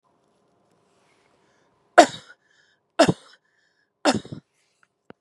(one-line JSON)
{"three_cough_length": "5.2 s", "three_cough_amplitude": 32768, "three_cough_signal_mean_std_ratio": 0.19, "survey_phase": "beta (2021-08-13 to 2022-03-07)", "age": "45-64", "gender": "Female", "wearing_mask": "No", "symptom_none": true, "smoker_status": "Never smoked", "respiratory_condition_asthma": false, "respiratory_condition_other": false, "recruitment_source": "REACT", "submission_delay": "3 days", "covid_test_result": "Negative", "covid_test_method": "RT-qPCR", "influenza_a_test_result": "Negative", "influenza_b_test_result": "Negative"}